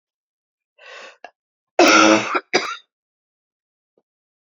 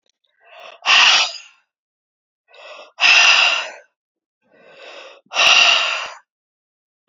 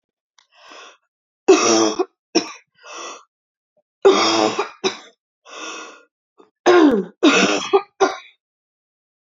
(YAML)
cough_length: 4.4 s
cough_amplitude: 29241
cough_signal_mean_std_ratio: 0.31
exhalation_length: 7.1 s
exhalation_amplitude: 32259
exhalation_signal_mean_std_ratio: 0.43
three_cough_length: 9.4 s
three_cough_amplitude: 27874
three_cough_signal_mean_std_ratio: 0.41
survey_phase: beta (2021-08-13 to 2022-03-07)
age: 18-44
gender: Female
wearing_mask: 'No'
symptom_cough_any: true
symptom_runny_or_blocked_nose: true
symptom_sore_throat: true
symptom_fatigue: true
symptom_headache: true
symptom_change_to_sense_of_smell_or_taste: true
symptom_onset: 4 days
smoker_status: Ex-smoker
respiratory_condition_asthma: false
respiratory_condition_other: false
recruitment_source: Test and Trace
submission_delay: 2 days
covid_test_result: Positive
covid_test_method: RT-qPCR
covid_ct_value: 17.6
covid_ct_gene: ORF1ab gene
covid_ct_mean: 18.1
covid_viral_load: 1100000 copies/ml
covid_viral_load_category: High viral load (>1M copies/ml)